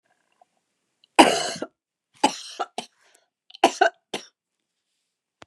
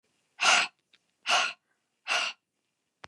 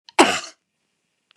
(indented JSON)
{
  "three_cough_length": "5.5 s",
  "three_cough_amplitude": 29204,
  "three_cough_signal_mean_std_ratio": 0.24,
  "exhalation_length": "3.1 s",
  "exhalation_amplitude": 10902,
  "exhalation_signal_mean_std_ratio": 0.38,
  "cough_length": "1.4 s",
  "cough_amplitude": 29204,
  "cough_signal_mean_std_ratio": 0.27,
  "survey_phase": "beta (2021-08-13 to 2022-03-07)",
  "age": "65+",
  "gender": "Female",
  "wearing_mask": "No",
  "symptom_runny_or_blocked_nose": true,
  "symptom_sore_throat": true,
  "symptom_headache": true,
  "symptom_onset": "3 days",
  "smoker_status": "Never smoked",
  "respiratory_condition_asthma": false,
  "respiratory_condition_other": false,
  "recruitment_source": "REACT",
  "submission_delay": "1 day",
  "covid_test_result": "Negative",
  "covid_test_method": "RT-qPCR",
  "influenza_a_test_result": "Negative",
  "influenza_b_test_result": "Negative"
}